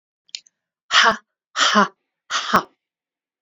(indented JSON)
{
  "exhalation_length": "3.4 s",
  "exhalation_amplitude": 27381,
  "exhalation_signal_mean_std_ratio": 0.36,
  "survey_phase": "alpha (2021-03-01 to 2021-08-12)",
  "age": "45-64",
  "gender": "Female",
  "wearing_mask": "No",
  "symptom_none": true,
  "smoker_status": "Ex-smoker",
  "respiratory_condition_asthma": false,
  "respiratory_condition_other": false,
  "recruitment_source": "REACT",
  "submission_delay": "2 days",
  "covid_test_result": "Negative",
  "covid_test_method": "RT-qPCR"
}